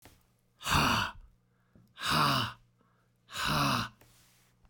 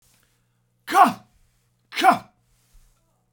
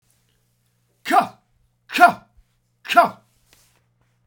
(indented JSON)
{
  "exhalation_length": "4.7 s",
  "exhalation_amplitude": 6409,
  "exhalation_signal_mean_std_ratio": 0.49,
  "cough_length": "3.3 s",
  "cough_amplitude": 27645,
  "cough_signal_mean_std_ratio": 0.27,
  "three_cough_length": "4.3 s",
  "three_cough_amplitude": 32768,
  "three_cough_signal_mean_std_ratio": 0.26,
  "survey_phase": "beta (2021-08-13 to 2022-03-07)",
  "age": "45-64",
  "gender": "Male",
  "wearing_mask": "No",
  "symptom_none": true,
  "smoker_status": "Ex-smoker",
  "respiratory_condition_asthma": false,
  "respiratory_condition_other": false,
  "recruitment_source": "REACT",
  "submission_delay": "2 days",
  "covid_test_result": "Negative",
  "covid_test_method": "RT-qPCR",
  "covid_ct_value": 40.0,
  "covid_ct_gene": "N gene",
  "influenza_a_test_result": "Negative",
  "influenza_b_test_result": "Positive",
  "influenza_b_ct_value": 34.6
}